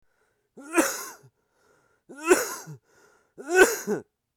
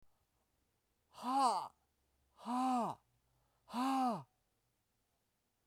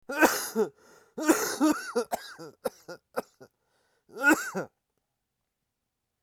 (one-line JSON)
{"three_cough_length": "4.4 s", "three_cough_amplitude": 23672, "three_cough_signal_mean_std_ratio": 0.34, "exhalation_length": "5.7 s", "exhalation_amplitude": 2510, "exhalation_signal_mean_std_ratio": 0.43, "cough_length": "6.2 s", "cough_amplitude": 13394, "cough_signal_mean_std_ratio": 0.4, "survey_phase": "beta (2021-08-13 to 2022-03-07)", "age": "18-44", "gender": "Male", "wearing_mask": "Yes", "symptom_cough_any": true, "symptom_runny_or_blocked_nose": true, "symptom_sore_throat": true, "symptom_fatigue": true, "symptom_fever_high_temperature": true, "symptom_change_to_sense_of_smell_or_taste": true, "symptom_loss_of_taste": true, "smoker_status": "Never smoked", "respiratory_condition_asthma": false, "respiratory_condition_other": false, "recruitment_source": "Test and Trace", "submission_delay": "2 days", "covid_test_result": "Positive", "covid_test_method": "RT-qPCR", "covid_ct_value": 19.8, "covid_ct_gene": "N gene", "covid_ct_mean": 20.3, "covid_viral_load": "220000 copies/ml", "covid_viral_load_category": "Low viral load (10K-1M copies/ml)"}